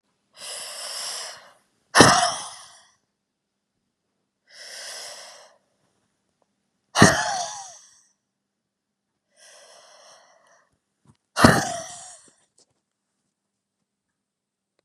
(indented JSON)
{
  "exhalation_length": "14.8 s",
  "exhalation_amplitude": 32768,
  "exhalation_signal_mean_std_ratio": 0.24,
  "survey_phase": "beta (2021-08-13 to 2022-03-07)",
  "age": "18-44",
  "gender": "Female",
  "wearing_mask": "No",
  "symptom_none": true,
  "smoker_status": "Never smoked",
  "respiratory_condition_asthma": true,
  "respiratory_condition_other": false,
  "recruitment_source": "REACT",
  "submission_delay": "5 days",
  "covid_test_result": "Negative",
  "covid_test_method": "RT-qPCR",
  "influenza_a_test_result": "Negative",
  "influenza_b_test_result": "Negative"
}